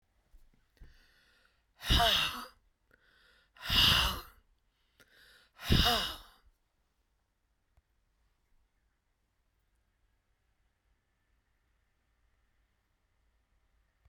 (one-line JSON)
{"exhalation_length": "14.1 s", "exhalation_amplitude": 7618, "exhalation_signal_mean_std_ratio": 0.27, "survey_phase": "beta (2021-08-13 to 2022-03-07)", "age": "65+", "gender": "Female", "wearing_mask": "No", "symptom_cough_any": true, "symptom_diarrhoea": true, "symptom_fatigue": true, "symptom_onset": "12 days", "smoker_status": "Ex-smoker", "respiratory_condition_asthma": false, "respiratory_condition_other": false, "recruitment_source": "REACT", "submission_delay": "1 day", "covid_test_result": "Negative", "covid_test_method": "RT-qPCR"}